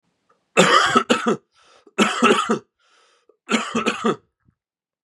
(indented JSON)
{
  "three_cough_length": "5.0 s",
  "three_cough_amplitude": 32460,
  "three_cough_signal_mean_std_ratio": 0.46,
  "survey_phase": "beta (2021-08-13 to 2022-03-07)",
  "age": "18-44",
  "gender": "Male",
  "wearing_mask": "No",
  "symptom_cough_any": true,
  "symptom_runny_or_blocked_nose": true,
  "symptom_headache": true,
  "symptom_onset": "3 days",
  "smoker_status": "Current smoker (1 to 10 cigarettes per day)",
  "respiratory_condition_asthma": false,
  "respiratory_condition_other": false,
  "recruitment_source": "Test and Trace",
  "submission_delay": "1 day",
  "covid_test_result": "Positive",
  "covid_test_method": "ePCR"
}